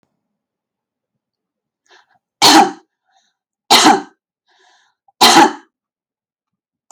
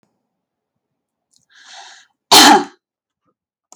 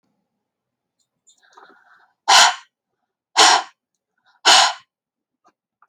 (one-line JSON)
{"three_cough_length": "6.9 s", "three_cough_amplitude": 32768, "three_cough_signal_mean_std_ratio": 0.3, "cough_length": "3.8 s", "cough_amplitude": 32768, "cough_signal_mean_std_ratio": 0.25, "exhalation_length": "5.9 s", "exhalation_amplitude": 32768, "exhalation_signal_mean_std_ratio": 0.29, "survey_phase": "alpha (2021-03-01 to 2021-08-12)", "age": "45-64", "gender": "Female", "wearing_mask": "No", "symptom_none": true, "smoker_status": "Ex-smoker", "respiratory_condition_asthma": false, "respiratory_condition_other": false, "recruitment_source": "REACT", "submission_delay": "2 days", "covid_test_result": "Negative", "covid_test_method": "RT-qPCR"}